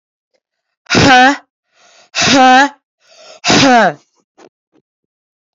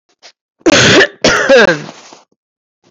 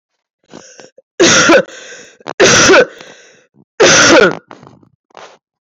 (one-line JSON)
{"exhalation_length": "5.5 s", "exhalation_amplitude": 32768, "exhalation_signal_mean_std_ratio": 0.46, "cough_length": "2.9 s", "cough_amplitude": 32767, "cough_signal_mean_std_ratio": 0.53, "three_cough_length": "5.6 s", "three_cough_amplitude": 32768, "three_cough_signal_mean_std_ratio": 0.5, "survey_phase": "beta (2021-08-13 to 2022-03-07)", "age": "45-64", "gender": "Female", "wearing_mask": "No", "symptom_runny_or_blocked_nose": true, "symptom_fatigue": true, "symptom_headache": true, "symptom_change_to_sense_of_smell_or_taste": true, "symptom_loss_of_taste": true, "symptom_onset": "3 days", "smoker_status": "Ex-smoker", "respiratory_condition_asthma": false, "respiratory_condition_other": false, "recruitment_source": "Test and Trace", "submission_delay": "1 day", "covid_test_result": "Positive", "covid_test_method": "RT-qPCR", "covid_ct_value": 18.3, "covid_ct_gene": "ORF1ab gene", "covid_ct_mean": 19.1, "covid_viral_load": "540000 copies/ml", "covid_viral_load_category": "Low viral load (10K-1M copies/ml)"}